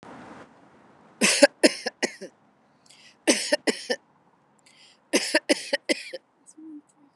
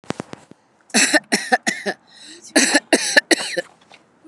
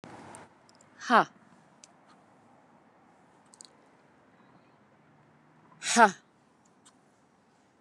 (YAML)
three_cough_length: 7.2 s
three_cough_amplitude: 29203
three_cough_signal_mean_std_ratio: 0.32
cough_length: 4.3 s
cough_amplitude: 29204
cough_signal_mean_std_ratio: 0.42
exhalation_length: 7.8 s
exhalation_amplitude: 19996
exhalation_signal_mean_std_ratio: 0.19
survey_phase: beta (2021-08-13 to 2022-03-07)
age: 45-64
gender: Female
wearing_mask: 'No'
symptom_none: true
smoker_status: Never smoked
respiratory_condition_asthma: false
respiratory_condition_other: false
recruitment_source: REACT
submission_delay: 1 day
covid_test_result: Negative
covid_test_method: RT-qPCR